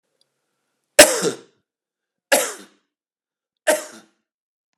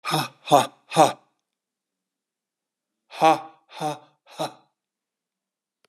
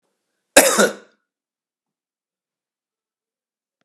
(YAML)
three_cough_length: 4.8 s
three_cough_amplitude: 32768
three_cough_signal_mean_std_ratio: 0.23
exhalation_length: 5.9 s
exhalation_amplitude: 29047
exhalation_signal_mean_std_ratio: 0.28
cough_length: 3.8 s
cough_amplitude: 32768
cough_signal_mean_std_ratio: 0.21
survey_phase: beta (2021-08-13 to 2022-03-07)
age: 65+
gender: Male
wearing_mask: 'No'
symptom_cough_any: true
symptom_runny_or_blocked_nose: true
symptom_onset: 12 days
smoker_status: Never smoked
respiratory_condition_asthma: false
respiratory_condition_other: false
recruitment_source: REACT
submission_delay: 1 day
covid_test_result: Negative
covid_test_method: RT-qPCR
influenza_a_test_result: Negative
influenza_b_test_result: Negative